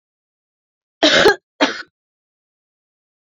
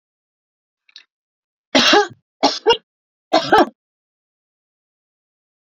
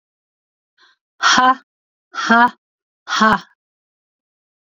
cough_length: 3.3 s
cough_amplitude: 29577
cough_signal_mean_std_ratio: 0.29
three_cough_length: 5.7 s
three_cough_amplitude: 29494
three_cough_signal_mean_std_ratio: 0.29
exhalation_length: 4.7 s
exhalation_amplitude: 32768
exhalation_signal_mean_std_ratio: 0.35
survey_phase: alpha (2021-03-01 to 2021-08-12)
age: 65+
gender: Female
wearing_mask: 'No'
symptom_cough_any: true
symptom_fatigue: true
symptom_headache: true
symptom_change_to_sense_of_smell_or_taste: true
symptom_loss_of_taste: true
symptom_onset: 4 days
smoker_status: Never smoked
respiratory_condition_asthma: false
respiratory_condition_other: false
recruitment_source: Test and Trace
submission_delay: 3 days
covid_test_result: Positive
covid_test_method: RT-qPCR
covid_ct_value: 17.7
covid_ct_gene: N gene
covid_ct_mean: 18.2
covid_viral_load: 1100000 copies/ml
covid_viral_load_category: High viral load (>1M copies/ml)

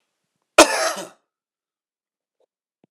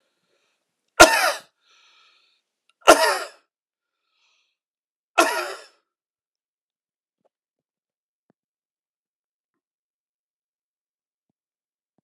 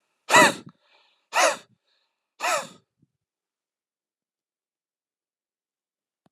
cough_length: 2.9 s
cough_amplitude: 32768
cough_signal_mean_std_ratio: 0.21
three_cough_length: 12.0 s
three_cough_amplitude: 32768
three_cough_signal_mean_std_ratio: 0.18
exhalation_length: 6.3 s
exhalation_amplitude: 27174
exhalation_signal_mean_std_ratio: 0.23
survey_phase: alpha (2021-03-01 to 2021-08-12)
age: 45-64
gender: Male
wearing_mask: 'No'
symptom_fatigue: true
symptom_change_to_sense_of_smell_or_taste: true
symptom_onset: 13 days
smoker_status: Ex-smoker
respiratory_condition_asthma: true
respiratory_condition_other: false
recruitment_source: REACT
submission_delay: 31 days
covid_test_result: Negative
covid_test_method: RT-qPCR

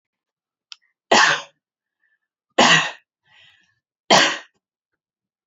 three_cough_length: 5.5 s
three_cough_amplitude: 29878
three_cough_signal_mean_std_ratio: 0.3
survey_phase: beta (2021-08-13 to 2022-03-07)
age: 18-44
gender: Female
wearing_mask: 'No'
symptom_none: true
smoker_status: Ex-smoker
respiratory_condition_asthma: false
respiratory_condition_other: false
recruitment_source: REACT
submission_delay: 2 days
covid_test_result: Negative
covid_test_method: RT-qPCR
influenza_a_test_result: Negative
influenza_b_test_result: Negative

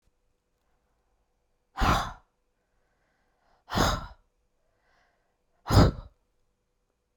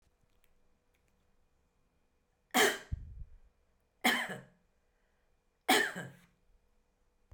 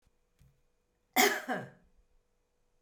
exhalation_length: 7.2 s
exhalation_amplitude: 16304
exhalation_signal_mean_std_ratio: 0.26
three_cough_length: 7.3 s
three_cough_amplitude: 7464
three_cough_signal_mean_std_ratio: 0.28
cough_length: 2.8 s
cough_amplitude: 9779
cough_signal_mean_std_ratio: 0.28
survey_phase: beta (2021-08-13 to 2022-03-07)
age: 65+
gender: Female
wearing_mask: 'No'
symptom_none: true
smoker_status: Ex-smoker
respiratory_condition_asthma: false
respiratory_condition_other: false
recruitment_source: REACT
submission_delay: 1 day
covid_test_result: Negative
covid_test_method: RT-qPCR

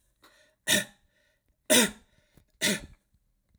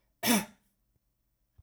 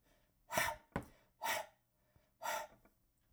three_cough_length: 3.6 s
three_cough_amplitude: 14213
three_cough_signal_mean_std_ratio: 0.3
cough_length: 1.6 s
cough_amplitude: 6983
cough_signal_mean_std_ratio: 0.29
exhalation_length: 3.3 s
exhalation_amplitude: 3468
exhalation_signal_mean_std_ratio: 0.4
survey_phase: alpha (2021-03-01 to 2021-08-12)
age: 45-64
gender: Male
wearing_mask: 'No'
symptom_none: true
smoker_status: Ex-smoker
respiratory_condition_asthma: false
respiratory_condition_other: false
recruitment_source: REACT
submission_delay: 2 days
covid_test_result: Negative
covid_test_method: RT-qPCR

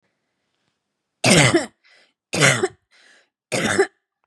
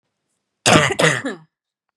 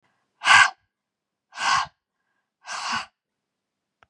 three_cough_length: 4.3 s
three_cough_amplitude: 30306
three_cough_signal_mean_std_ratio: 0.39
cough_length: 2.0 s
cough_amplitude: 32759
cough_signal_mean_std_ratio: 0.41
exhalation_length: 4.1 s
exhalation_amplitude: 29494
exhalation_signal_mean_std_ratio: 0.3
survey_phase: beta (2021-08-13 to 2022-03-07)
age: 18-44
gender: Female
wearing_mask: 'No'
symptom_none: true
smoker_status: Never smoked
respiratory_condition_asthma: false
respiratory_condition_other: false
recruitment_source: REACT
submission_delay: 3 days
covid_test_result: Negative
covid_test_method: RT-qPCR
influenza_a_test_result: Negative
influenza_b_test_result: Negative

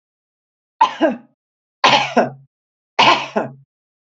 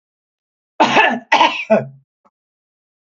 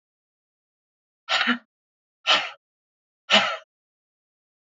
three_cough_length: 4.2 s
three_cough_amplitude: 29734
three_cough_signal_mean_std_ratio: 0.38
cough_length: 3.2 s
cough_amplitude: 28754
cough_signal_mean_std_ratio: 0.4
exhalation_length: 4.6 s
exhalation_amplitude: 20354
exhalation_signal_mean_std_ratio: 0.29
survey_phase: alpha (2021-03-01 to 2021-08-12)
age: 45-64
gender: Female
wearing_mask: 'No'
symptom_none: true
smoker_status: Ex-smoker
respiratory_condition_asthma: false
respiratory_condition_other: false
recruitment_source: REACT
submission_delay: 1 day
covid_test_result: Negative
covid_test_method: RT-qPCR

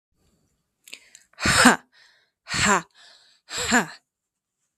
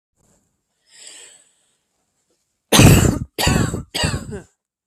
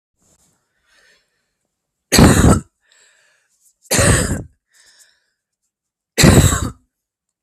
exhalation_length: 4.8 s
exhalation_amplitude: 32766
exhalation_signal_mean_std_ratio: 0.33
cough_length: 4.9 s
cough_amplitude: 32768
cough_signal_mean_std_ratio: 0.36
three_cough_length: 7.4 s
three_cough_amplitude: 32766
three_cough_signal_mean_std_ratio: 0.34
survey_phase: beta (2021-08-13 to 2022-03-07)
age: 18-44
gender: Female
wearing_mask: 'No'
symptom_cough_any: true
symptom_runny_or_blocked_nose: true
symptom_fatigue: true
symptom_headache: true
symptom_other: true
smoker_status: Ex-smoker
respiratory_condition_asthma: false
respiratory_condition_other: false
recruitment_source: Test and Trace
submission_delay: 1 day
covid_test_result: Positive
covid_test_method: LFT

